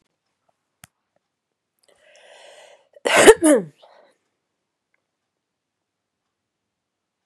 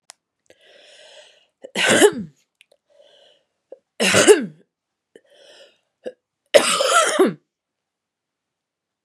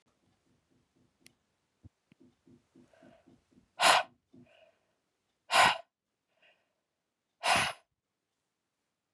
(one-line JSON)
{"cough_length": "7.3 s", "cough_amplitude": 32768, "cough_signal_mean_std_ratio": 0.19, "three_cough_length": "9.0 s", "three_cough_amplitude": 32768, "three_cough_signal_mean_std_ratio": 0.32, "exhalation_length": "9.1 s", "exhalation_amplitude": 10636, "exhalation_signal_mean_std_ratio": 0.23, "survey_phase": "beta (2021-08-13 to 2022-03-07)", "age": "18-44", "gender": "Female", "wearing_mask": "No", "symptom_cough_any": true, "symptom_shortness_of_breath": true, "symptom_sore_throat": true, "symptom_fatigue": true, "symptom_headache": true, "symptom_onset": "3 days", "smoker_status": "Never smoked", "respiratory_condition_asthma": true, "respiratory_condition_other": false, "recruitment_source": "Test and Trace", "submission_delay": "2 days", "covid_test_result": "Positive", "covid_test_method": "RT-qPCR", "covid_ct_value": 15.3, "covid_ct_gene": "ORF1ab gene"}